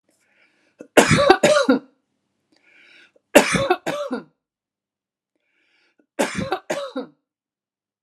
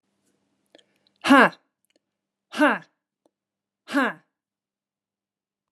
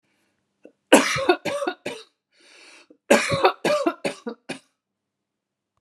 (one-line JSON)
{"three_cough_length": "8.0 s", "three_cough_amplitude": 32768, "three_cough_signal_mean_std_ratio": 0.34, "exhalation_length": "5.7 s", "exhalation_amplitude": 28006, "exhalation_signal_mean_std_ratio": 0.23, "cough_length": "5.8 s", "cough_amplitude": 32767, "cough_signal_mean_std_ratio": 0.36, "survey_phase": "alpha (2021-03-01 to 2021-08-12)", "age": "45-64", "gender": "Female", "wearing_mask": "No", "symptom_none": true, "symptom_onset": "13 days", "smoker_status": "Never smoked", "respiratory_condition_asthma": false, "respiratory_condition_other": false, "recruitment_source": "REACT", "submission_delay": "2 days", "covid_test_result": "Negative", "covid_test_method": "RT-qPCR"}